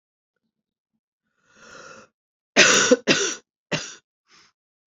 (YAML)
three_cough_length: 4.9 s
three_cough_amplitude: 29789
three_cough_signal_mean_std_ratio: 0.3
survey_phase: beta (2021-08-13 to 2022-03-07)
age: 45-64
gender: Female
wearing_mask: 'No'
symptom_cough_any: true
symptom_new_continuous_cough: true
symptom_runny_or_blocked_nose: true
symptom_sore_throat: true
symptom_fatigue: true
symptom_headache: true
symptom_other: true
symptom_onset: 3 days
smoker_status: Never smoked
respiratory_condition_asthma: false
respiratory_condition_other: false
recruitment_source: Test and Trace
submission_delay: 2 days
covid_test_result: Positive
covid_test_method: RT-qPCR
covid_ct_value: 16.6
covid_ct_gene: ORF1ab gene
covid_ct_mean: 17.1
covid_viral_load: 2500000 copies/ml
covid_viral_load_category: High viral load (>1M copies/ml)